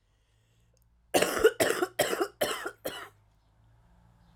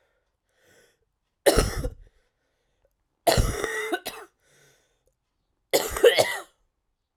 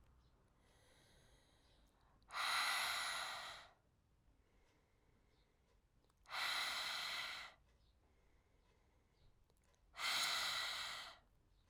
{"cough_length": "4.4 s", "cough_amplitude": 11856, "cough_signal_mean_std_ratio": 0.39, "three_cough_length": "7.2 s", "three_cough_amplitude": 24812, "three_cough_signal_mean_std_ratio": 0.33, "exhalation_length": "11.7 s", "exhalation_amplitude": 1295, "exhalation_signal_mean_std_ratio": 0.49, "survey_phase": "alpha (2021-03-01 to 2021-08-12)", "age": "18-44", "gender": "Female", "wearing_mask": "No", "symptom_cough_any": true, "symptom_fatigue": true, "symptom_headache": true, "symptom_change_to_sense_of_smell_or_taste": true, "symptom_loss_of_taste": true, "symptom_onset": "3 days", "smoker_status": "Ex-smoker", "respiratory_condition_asthma": false, "respiratory_condition_other": false, "recruitment_source": "Test and Trace", "submission_delay": "2 days", "covid_test_result": "Positive", "covid_test_method": "RT-qPCR", "covid_ct_value": 15.7, "covid_ct_gene": "ORF1ab gene", "covid_ct_mean": 16.6, "covid_viral_load": "3600000 copies/ml", "covid_viral_load_category": "High viral load (>1M copies/ml)"}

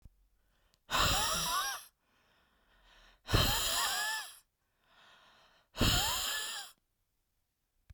{"exhalation_length": "7.9 s", "exhalation_amplitude": 6914, "exhalation_signal_mean_std_ratio": 0.49, "survey_phase": "beta (2021-08-13 to 2022-03-07)", "age": "45-64", "gender": "Female", "wearing_mask": "No", "symptom_other": true, "symptom_onset": "8 days", "smoker_status": "Ex-smoker", "respiratory_condition_asthma": false, "respiratory_condition_other": false, "recruitment_source": "REACT", "submission_delay": "1 day", "covid_test_result": "Negative", "covid_test_method": "RT-qPCR", "influenza_a_test_result": "Negative", "influenza_b_test_result": "Negative"}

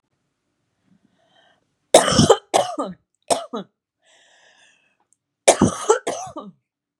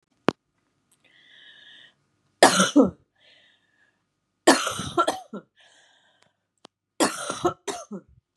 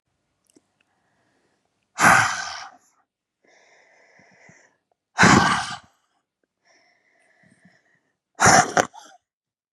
{"cough_length": "7.0 s", "cough_amplitude": 32768, "cough_signal_mean_std_ratio": 0.3, "three_cough_length": "8.4 s", "three_cough_amplitude": 32420, "three_cough_signal_mean_std_ratio": 0.29, "exhalation_length": "9.7 s", "exhalation_amplitude": 32767, "exhalation_signal_mean_std_ratio": 0.28, "survey_phase": "beta (2021-08-13 to 2022-03-07)", "age": "18-44", "gender": "Female", "wearing_mask": "No", "symptom_cough_any": true, "symptom_runny_or_blocked_nose": true, "symptom_sore_throat": true, "symptom_fatigue": true, "symptom_headache": true, "symptom_other": true, "symptom_onset": "6 days", "smoker_status": "Ex-smoker", "respiratory_condition_asthma": false, "respiratory_condition_other": false, "recruitment_source": "Test and Trace", "submission_delay": "1 day", "covid_test_result": "Positive", "covid_test_method": "RT-qPCR", "covid_ct_value": 23.7, "covid_ct_gene": "N gene", "covid_ct_mean": 24.0, "covid_viral_load": "14000 copies/ml", "covid_viral_load_category": "Low viral load (10K-1M copies/ml)"}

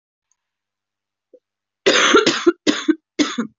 {"cough_length": "3.6 s", "cough_amplitude": 27808, "cough_signal_mean_std_ratio": 0.41, "survey_phase": "beta (2021-08-13 to 2022-03-07)", "age": "18-44", "gender": "Female", "wearing_mask": "No", "symptom_cough_any": true, "symptom_runny_or_blocked_nose": true, "symptom_sore_throat": true, "symptom_fatigue": true, "symptom_fever_high_temperature": true, "symptom_headache": true, "symptom_change_to_sense_of_smell_or_taste": true, "symptom_other": true, "symptom_onset": "3 days", "smoker_status": "Never smoked", "respiratory_condition_asthma": false, "respiratory_condition_other": false, "recruitment_source": "Test and Trace", "submission_delay": "1 day", "covid_test_result": "Positive", "covid_test_method": "RT-qPCR", "covid_ct_value": 22.0, "covid_ct_gene": "ORF1ab gene", "covid_ct_mean": 22.6, "covid_viral_load": "38000 copies/ml", "covid_viral_load_category": "Low viral load (10K-1M copies/ml)"}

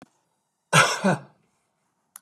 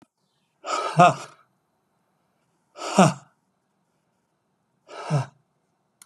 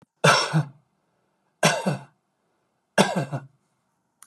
{"cough_length": "2.2 s", "cough_amplitude": 24516, "cough_signal_mean_std_ratio": 0.32, "exhalation_length": "6.1 s", "exhalation_amplitude": 28982, "exhalation_signal_mean_std_ratio": 0.26, "three_cough_length": "4.3 s", "three_cough_amplitude": 26488, "three_cough_signal_mean_std_ratio": 0.37, "survey_phase": "beta (2021-08-13 to 2022-03-07)", "age": "65+", "gender": "Male", "wearing_mask": "No", "symptom_cough_any": true, "symptom_sore_throat": true, "smoker_status": "Never smoked", "respiratory_condition_asthma": false, "respiratory_condition_other": false, "recruitment_source": "REACT", "submission_delay": "3 days", "covid_test_result": "Negative", "covid_test_method": "RT-qPCR", "influenza_a_test_result": "Negative", "influenza_b_test_result": "Negative"}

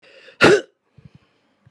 {"exhalation_length": "1.7 s", "exhalation_amplitude": 32768, "exhalation_signal_mean_std_ratio": 0.28, "survey_phase": "beta (2021-08-13 to 2022-03-07)", "age": "45-64", "gender": "Female", "wearing_mask": "No", "symptom_none": true, "smoker_status": "Never smoked", "respiratory_condition_asthma": false, "respiratory_condition_other": false, "recruitment_source": "REACT", "submission_delay": "0 days", "covid_test_result": "Negative", "covid_test_method": "RT-qPCR", "influenza_a_test_result": "Negative", "influenza_b_test_result": "Negative"}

